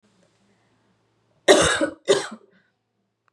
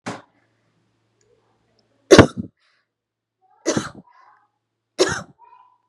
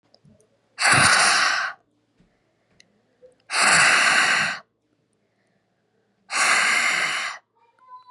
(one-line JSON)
{"cough_length": "3.3 s", "cough_amplitude": 32768, "cough_signal_mean_std_ratio": 0.31, "three_cough_length": "5.9 s", "three_cough_amplitude": 32768, "three_cough_signal_mean_std_ratio": 0.2, "exhalation_length": "8.1 s", "exhalation_amplitude": 22162, "exhalation_signal_mean_std_ratio": 0.52, "survey_phase": "beta (2021-08-13 to 2022-03-07)", "age": "18-44", "gender": "Female", "wearing_mask": "No", "symptom_cough_any": true, "symptom_runny_or_blocked_nose": true, "symptom_fatigue": true, "symptom_change_to_sense_of_smell_or_taste": true, "symptom_other": true, "symptom_onset": "4 days", "smoker_status": "Never smoked", "respiratory_condition_asthma": false, "respiratory_condition_other": false, "recruitment_source": "Test and Trace", "submission_delay": "2 days", "covid_test_result": "Positive", "covid_test_method": "RT-qPCR"}